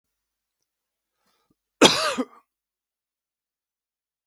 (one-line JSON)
{"cough_length": "4.3 s", "cough_amplitude": 32768, "cough_signal_mean_std_ratio": 0.19, "survey_phase": "beta (2021-08-13 to 2022-03-07)", "age": "45-64", "gender": "Male", "wearing_mask": "No", "symptom_none": true, "smoker_status": "Never smoked", "respiratory_condition_asthma": false, "respiratory_condition_other": false, "recruitment_source": "REACT", "submission_delay": "1 day", "covid_test_result": "Negative", "covid_test_method": "RT-qPCR"}